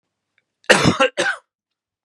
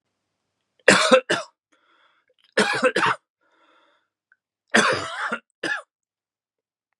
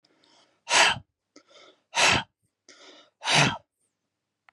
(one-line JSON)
{"cough_length": "2.0 s", "cough_amplitude": 32768, "cough_signal_mean_std_ratio": 0.38, "three_cough_length": "7.0 s", "three_cough_amplitude": 32118, "three_cough_signal_mean_std_ratio": 0.35, "exhalation_length": "4.5 s", "exhalation_amplitude": 21688, "exhalation_signal_mean_std_ratio": 0.35, "survey_phase": "beta (2021-08-13 to 2022-03-07)", "age": "18-44", "gender": "Male", "wearing_mask": "No", "symptom_cough_any": true, "symptom_onset": "7 days", "smoker_status": "Never smoked", "respiratory_condition_asthma": false, "respiratory_condition_other": false, "recruitment_source": "Test and Trace", "submission_delay": "3 days", "covid_test_result": "Positive", "covid_test_method": "RT-qPCR", "covid_ct_value": 19.5, "covid_ct_gene": "N gene", "covid_ct_mean": 19.7, "covid_viral_load": "340000 copies/ml", "covid_viral_load_category": "Low viral load (10K-1M copies/ml)"}